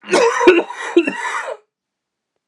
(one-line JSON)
{"three_cough_length": "2.5 s", "three_cough_amplitude": 32768, "three_cough_signal_mean_std_ratio": 0.51, "survey_phase": "beta (2021-08-13 to 2022-03-07)", "age": "18-44", "gender": "Male", "wearing_mask": "No", "symptom_cough_any": true, "symptom_new_continuous_cough": true, "symptom_runny_or_blocked_nose": true, "symptom_sore_throat": true, "symptom_headache": true, "symptom_change_to_sense_of_smell_or_taste": true, "symptom_loss_of_taste": true, "symptom_other": true, "symptom_onset": "5 days", "smoker_status": "Never smoked", "respiratory_condition_asthma": false, "respiratory_condition_other": false, "recruitment_source": "Test and Trace", "submission_delay": "1 day", "covid_test_result": "Positive", "covid_test_method": "RT-qPCR", "covid_ct_value": 18.5, "covid_ct_gene": "ORF1ab gene", "covid_ct_mean": 19.5, "covid_viral_load": "410000 copies/ml", "covid_viral_load_category": "Low viral load (10K-1M copies/ml)"}